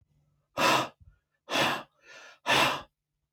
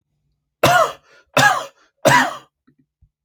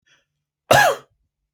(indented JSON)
{
  "exhalation_length": "3.3 s",
  "exhalation_amplitude": 10504,
  "exhalation_signal_mean_std_ratio": 0.44,
  "three_cough_length": "3.2 s",
  "three_cough_amplitude": 32658,
  "three_cough_signal_mean_std_ratio": 0.41,
  "cough_length": "1.5 s",
  "cough_amplitude": 30942,
  "cough_signal_mean_std_ratio": 0.32,
  "survey_phase": "alpha (2021-03-01 to 2021-08-12)",
  "age": "45-64",
  "gender": "Male",
  "wearing_mask": "No",
  "symptom_none": true,
  "smoker_status": "Never smoked",
  "respiratory_condition_asthma": false,
  "respiratory_condition_other": false,
  "recruitment_source": "REACT",
  "submission_delay": "1 day",
  "covid_test_result": "Negative",
  "covid_test_method": "RT-qPCR"
}